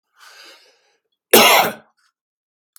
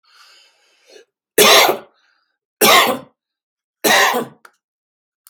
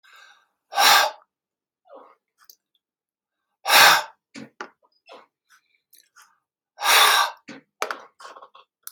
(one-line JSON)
{"cough_length": "2.8 s", "cough_amplitude": 32768, "cough_signal_mean_std_ratio": 0.3, "three_cough_length": "5.3 s", "three_cough_amplitude": 32768, "three_cough_signal_mean_std_ratio": 0.38, "exhalation_length": "8.9 s", "exhalation_amplitude": 30320, "exhalation_signal_mean_std_ratio": 0.3, "survey_phase": "beta (2021-08-13 to 2022-03-07)", "age": "45-64", "gender": "Male", "wearing_mask": "No", "symptom_none": true, "smoker_status": "Never smoked", "respiratory_condition_asthma": false, "respiratory_condition_other": false, "recruitment_source": "REACT", "submission_delay": "1 day", "covid_test_result": "Negative", "covid_test_method": "RT-qPCR", "influenza_a_test_result": "Unknown/Void", "influenza_b_test_result": "Unknown/Void"}